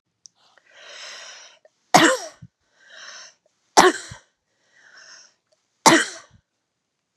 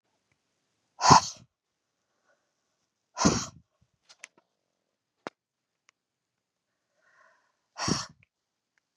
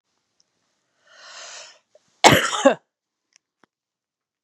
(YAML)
three_cough_length: 7.2 s
three_cough_amplitude: 32768
three_cough_signal_mean_std_ratio: 0.25
exhalation_length: 9.0 s
exhalation_amplitude: 29600
exhalation_signal_mean_std_ratio: 0.18
cough_length: 4.4 s
cough_amplitude: 32768
cough_signal_mean_std_ratio: 0.23
survey_phase: beta (2021-08-13 to 2022-03-07)
age: 45-64
gender: Female
wearing_mask: 'No'
symptom_none: true
smoker_status: Never smoked
respiratory_condition_asthma: false
respiratory_condition_other: false
recruitment_source: REACT
submission_delay: 1 day
covid_test_result: Negative
covid_test_method: RT-qPCR
influenza_a_test_result: Negative
influenza_b_test_result: Negative